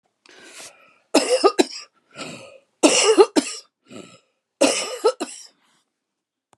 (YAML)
three_cough_length: 6.6 s
three_cough_amplitude: 31308
three_cough_signal_mean_std_ratio: 0.36
survey_phase: beta (2021-08-13 to 2022-03-07)
age: 65+
gender: Female
wearing_mask: 'No'
symptom_cough_any: true
symptom_fatigue: true
symptom_onset: 13 days
smoker_status: Never smoked
respiratory_condition_asthma: false
respiratory_condition_other: true
recruitment_source: REACT
submission_delay: 6 days
covid_test_result: Negative
covid_test_method: RT-qPCR
influenza_a_test_result: Negative
influenza_b_test_result: Negative